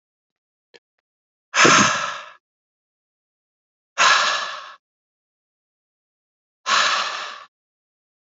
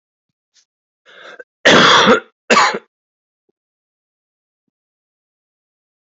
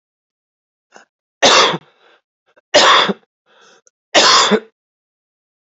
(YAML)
exhalation_length: 8.3 s
exhalation_amplitude: 30028
exhalation_signal_mean_std_ratio: 0.34
cough_length: 6.1 s
cough_amplitude: 30033
cough_signal_mean_std_ratio: 0.3
three_cough_length: 5.7 s
three_cough_amplitude: 30887
three_cough_signal_mean_std_ratio: 0.38
survey_phase: beta (2021-08-13 to 2022-03-07)
age: 45-64
gender: Male
wearing_mask: 'No'
symptom_cough_any: true
symptom_runny_or_blocked_nose: true
symptom_sore_throat: true
symptom_fever_high_temperature: true
symptom_headache: true
symptom_onset: 3 days
smoker_status: Ex-smoker
respiratory_condition_asthma: false
respiratory_condition_other: false
recruitment_source: Test and Trace
submission_delay: 2 days
covid_test_result: Positive
covid_test_method: RT-qPCR
covid_ct_value: 25.5
covid_ct_gene: N gene